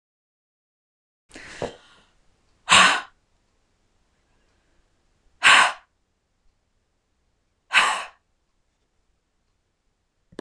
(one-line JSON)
{"exhalation_length": "10.4 s", "exhalation_amplitude": 25859, "exhalation_signal_mean_std_ratio": 0.23, "survey_phase": "beta (2021-08-13 to 2022-03-07)", "age": "45-64", "gender": "Female", "wearing_mask": "No", "symptom_none": true, "smoker_status": "Current smoker (1 to 10 cigarettes per day)", "respiratory_condition_asthma": false, "respiratory_condition_other": false, "recruitment_source": "REACT", "submission_delay": "3 days", "covid_test_result": "Negative", "covid_test_method": "RT-qPCR"}